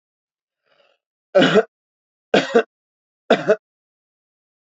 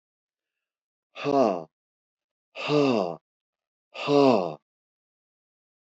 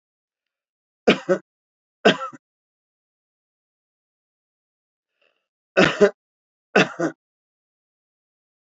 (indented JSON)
{
  "three_cough_length": "4.8 s",
  "three_cough_amplitude": 28539,
  "three_cough_signal_mean_std_ratio": 0.28,
  "exhalation_length": "5.8 s",
  "exhalation_amplitude": 14415,
  "exhalation_signal_mean_std_ratio": 0.36,
  "cough_length": "8.7 s",
  "cough_amplitude": 30179,
  "cough_signal_mean_std_ratio": 0.22,
  "survey_phase": "beta (2021-08-13 to 2022-03-07)",
  "age": "65+",
  "gender": "Male",
  "wearing_mask": "No",
  "symptom_none": true,
  "smoker_status": "Never smoked",
  "respiratory_condition_asthma": false,
  "respiratory_condition_other": false,
  "recruitment_source": "Test and Trace",
  "submission_delay": "1 day",
  "covid_test_result": "Negative",
  "covid_test_method": "LFT"
}